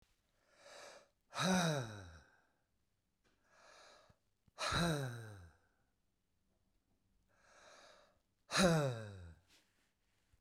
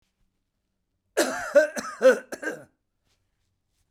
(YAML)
exhalation_length: 10.4 s
exhalation_amplitude: 4333
exhalation_signal_mean_std_ratio: 0.35
cough_length: 3.9 s
cough_amplitude: 14203
cough_signal_mean_std_ratio: 0.31
survey_phase: beta (2021-08-13 to 2022-03-07)
age: 65+
gender: Male
wearing_mask: 'No'
symptom_none: true
smoker_status: Ex-smoker
respiratory_condition_asthma: false
respiratory_condition_other: false
recruitment_source: REACT
submission_delay: 2 days
covid_test_result: Negative
covid_test_method: RT-qPCR
influenza_a_test_result: Negative
influenza_b_test_result: Negative